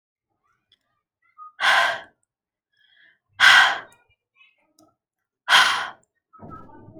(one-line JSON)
{"exhalation_length": "7.0 s", "exhalation_amplitude": 29413, "exhalation_signal_mean_std_ratio": 0.31, "survey_phase": "alpha (2021-03-01 to 2021-08-12)", "age": "18-44", "gender": "Female", "wearing_mask": "No", "symptom_none": true, "smoker_status": "Never smoked", "respiratory_condition_asthma": true, "respiratory_condition_other": false, "recruitment_source": "REACT", "submission_delay": "2 days", "covid_test_result": "Negative", "covid_test_method": "RT-qPCR"}